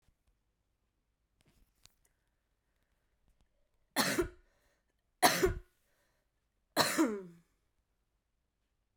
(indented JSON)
{
  "three_cough_length": "9.0 s",
  "three_cough_amplitude": 9289,
  "three_cough_signal_mean_std_ratio": 0.26,
  "survey_phase": "beta (2021-08-13 to 2022-03-07)",
  "age": "18-44",
  "gender": "Female",
  "wearing_mask": "No",
  "symptom_cough_any": true,
  "symptom_runny_or_blocked_nose": true,
  "symptom_change_to_sense_of_smell_or_taste": true,
  "symptom_loss_of_taste": true,
  "smoker_status": "Ex-smoker",
  "respiratory_condition_asthma": false,
  "respiratory_condition_other": false,
  "recruitment_source": "Test and Trace",
  "submission_delay": "2 days",
  "covid_test_result": "Positive",
  "covid_test_method": "RT-qPCR",
  "covid_ct_value": 21.7,
  "covid_ct_gene": "ORF1ab gene"
}